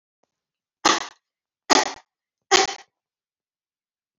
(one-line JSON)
{"three_cough_length": "4.2 s", "three_cough_amplitude": 31590, "three_cough_signal_mean_std_ratio": 0.25, "survey_phase": "beta (2021-08-13 to 2022-03-07)", "age": "65+", "gender": "Female", "wearing_mask": "No", "symptom_none": true, "smoker_status": "Ex-smoker", "respiratory_condition_asthma": false, "respiratory_condition_other": false, "recruitment_source": "REACT", "submission_delay": "7 days", "covid_test_result": "Negative", "covid_test_method": "RT-qPCR"}